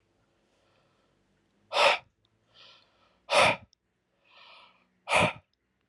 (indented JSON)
{
  "exhalation_length": "5.9 s",
  "exhalation_amplitude": 11367,
  "exhalation_signal_mean_std_ratio": 0.28,
  "survey_phase": "alpha (2021-03-01 to 2021-08-12)",
  "age": "18-44",
  "gender": "Male",
  "wearing_mask": "No",
  "symptom_none": true,
  "symptom_onset": "13 days",
  "smoker_status": "Never smoked",
  "respiratory_condition_asthma": false,
  "respiratory_condition_other": false,
  "recruitment_source": "REACT",
  "submission_delay": "1 day",
  "covid_test_result": "Negative",
  "covid_test_method": "RT-qPCR"
}